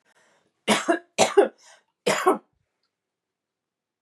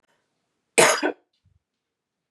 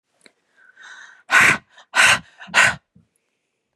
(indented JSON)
{
  "three_cough_length": "4.0 s",
  "three_cough_amplitude": 22503,
  "three_cough_signal_mean_std_ratio": 0.33,
  "cough_length": "2.3 s",
  "cough_amplitude": 24437,
  "cough_signal_mean_std_ratio": 0.27,
  "exhalation_length": "3.8 s",
  "exhalation_amplitude": 30686,
  "exhalation_signal_mean_std_ratio": 0.36,
  "survey_phase": "beta (2021-08-13 to 2022-03-07)",
  "age": "45-64",
  "gender": "Female",
  "wearing_mask": "No",
  "symptom_cough_any": true,
  "symptom_sore_throat": true,
  "symptom_fatigue": true,
  "symptom_onset": "12 days",
  "smoker_status": "Current smoker (1 to 10 cigarettes per day)",
  "respiratory_condition_asthma": false,
  "respiratory_condition_other": false,
  "recruitment_source": "REACT",
  "submission_delay": "1 day",
  "covid_test_result": "Negative",
  "covid_test_method": "RT-qPCR",
  "influenza_a_test_result": "Negative",
  "influenza_b_test_result": "Negative"
}